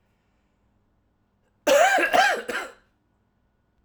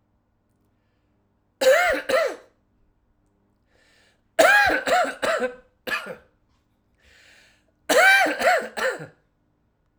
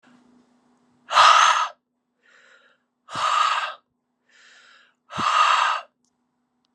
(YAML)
cough_length: 3.8 s
cough_amplitude: 16367
cough_signal_mean_std_ratio: 0.39
three_cough_length: 10.0 s
three_cough_amplitude: 32767
three_cough_signal_mean_std_ratio: 0.43
exhalation_length: 6.7 s
exhalation_amplitude: 27971
exhalation_signal_mean_std_ratio: 0.4
survey_phase: alpha (2021-03-01 to 2021-08-12)
age: 45-64
gender: Male
wearing_mask: 'No'
symptom_cough_any: true
symptom_fatigue: true
symptom_fever_high_temperature: true
symptom_headache: true
smoker_status: Ex-smoker
respiratory_condition_asthma: false
respiratory_condition_other: false
recruitment_source: Test and Trace
submission_delay: 1 day
covid_test_result: Positive
covid_test_method: RT-qPCR
covid_ct_value: 17.9
covid_ct_gene: N gene
covid_ct_mean: 18.9
covid_viral_load: 620000 copies/ml
covid_viral_load_category: Low viral load (10K-1M copies/ml)